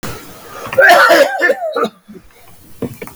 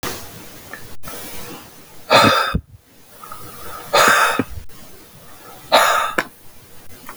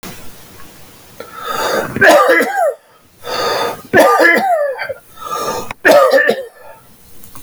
{"cough_length": "3.2 s", "cough_amplitude": 32768, "cough_signal_mean_std_ratio": 0.56, "exhalation_length": "7.2 s", "exhalation_amplitude": 32768, "exhalation_signal_mean_std_ratio": 0.5, "three_cough_length": "7.4 s", "three_cough_amplitude": 32768, "three_cough_signal_mean_std_ratio": 0.62, "survey_phase": "alpha (2021-03-01 to 2021-08-12)", "age": "18-44", "gender": "Male", "wearing_mask": "No", "symptom_none": true, "smoker_status": "Ex-smoker", "respiratory_condition_asthma": false, "respiratory_condition_other": false, "recruitment_source": "REACT", "submission_delay": "2 days", "covid_test_result": "Negative", "covid_test_method": "RT-qPCR"}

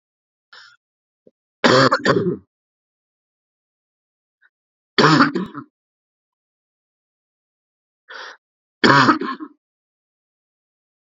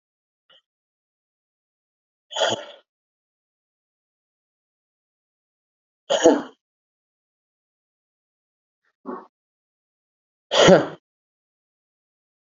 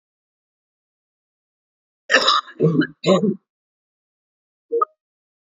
{"three_cough_length": "11.2 s", "three_cough_amplitude": 32768, "three_cough_signal_mean_std_ratio": 0.29, "exhalation_length": "12.5 s", "exhalation_amplitude": 28984, "exhalation_signal_mean_std_ratio": 0.19, "cough_length": "5.5 s", "cough_amplitude": 27928, "cough_signal_mean_std_ratio": 0.33, "survey_phase": "beta (2021-08-13 to 2022-03-07)", "age": "45-64", "gender": "Male", "wearing_mask": "Yes", "symptom_cough_any": true, "symptom_runny_or_blocked_nose": true, "smoker_status": "Ex-smoker", "respiratory_condition_asthma": false, "respiratory_condition_other": false, "recruitment_source": "Test and Trace", "submission_delay": "2 days", "covid_test_result": "Positive", "covid_test_method": "LFT"}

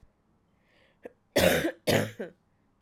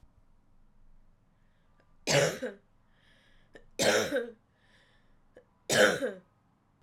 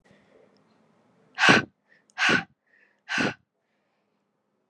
{"cough_length": "2.8 s", "cough_amplitude": 11220, "cough_signal_mean_std_ratio": 0.38, "three_cough_length": "6.8 s", "three_cough_amplitude": 10564, "three_cough_signal_mean_std_ratio": 0.35, "exhalation_length": "4.7 s", "exhalation_amplitude": 25518, "exhalation_signal_mean_std_ratio": 0.29, "survey_phase": "alpha (2021-03-01 to 2021-08-12)", "age": "18-44", "gender": "Female", "wearing_mask": "No", "symptom_cough_any": true, "symptom_new_continuous_cough": true, "symptom_fatigue": true, "symptom_fever_high_temperature": true, "symptom_headache": true, "symptom_change_to_sense_of_smell_or_taste": true, "symptom_loss_of_taste": true, "symptom_onset": "3 days", "smoker_status": "Never smoked", "respiratory_condition_asthma": false, "respiratory_condition_other": false, "recruitment_source": "Test and Trace", "submission_delay": "2 days", "covid_test_result": "Positive", "covid_test_method": "RT-qPCR", "covid_ct_value": 15.4, "covid_ct_gene": "ORF1ab gene", "covid_ct_mean": 16.0, "covid_viral_load": "5800000 copies/ml", "covid_viral_load_category": "High viral load (>1M copies/ml)"}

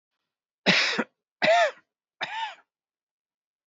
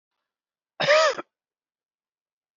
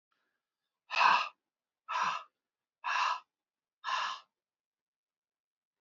{"three_cough_length": "3.7 s", "three_cough_amplitude": 16128, "three_cough_signal_mean_std_ratio": 0.38, "cough_length": "2.6 s", "cough_amplitude": 14343, "cough_signal_mean_std_ratio": 0.3, "exhalation_length": "5.8 s", "exhalation_amplitude": 8459, "exhalation_signal_mean_std_ratio": 0.35, "survey_phase": "beta (2021-08-13 to 2022-03-07)", "age": "65+", "gender": "Male", "wearing_mask": "No", "symptom_runny_or_blocked_nose": true, "symptom_shortness_of_breath": true, "symptom_sore_throat": true, "symptom_fatigue": true, "symptom_headache": true, "symptom_onset": "4 days", "smoker_status": "Ex-smoker", "respiratory_condition_asthma": false, "respiratory_condition_other": false, "recruitment_source": "Test and Trace", "submission_delay": "2 days", "covid_test_result": "Positive", "covid_test_method": "RT-qPCR", "covid_ct_value": 14.8, "covid_ct_gene": "ORF1ab gene", "covid_ct_mean": 15.1, "covid_viral_load": "11000000 copies/ml", "covid_viral_load_category": "High viral load (>1M copies/ml)"}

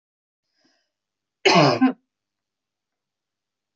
{"cough_length": "3.8 s", "cough_amplitude": 24682, "cough_signal_mean_std_ratio": 0.27, "survey_phase": "beta (2021-08-13 to 2022-03-07)", "age": "65+", "gender": "Female", "wearing_mask": "No", "symptom_none": true, "smoker_status": "Ex-smoker", "respiratory_condition_asthma": false, "respiratory_condition_other": false, "recruitment_source": "REACT", "submission_delay": "1 day", "covid_test_result": "Negative", "covid_test_method": "RT-qPCR"}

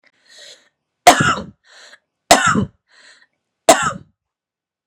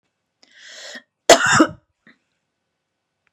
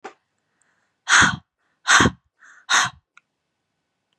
{"three_cough_length": "4.9 s", "three_cough_amplitude": 32768, "three_cough_signal_mean_std_ratio": 0.31, "cough_length": "3.3 s", "cough_amplitude": 32768, "cough_signal_mean_std_ratio": 0.26, "exhalation_length": "4.2 s", "exhalation_amplitude": 30234, "exhalation_signal_mean_std_ratio": 0.32, "survey_phase": "beta (2021-08-13 to 2022-03-07)", "age": "18-44", "gender": "Female", "wearing_mask": "No", "symptom_fatigue": true, "symptom_headache": true, "smoker_status": "Ex-smoker", "respiratory_condition_asthma": false, "respiratory_condition_other": false, "recruitment_source": "REACT", "submission_delay": "1 day", "covid_test_result": "Negative", "covid_test_method": "RT-qPCR", "influenza_a_test_result": "Negative", "influenza_b_test_result": "Negative"}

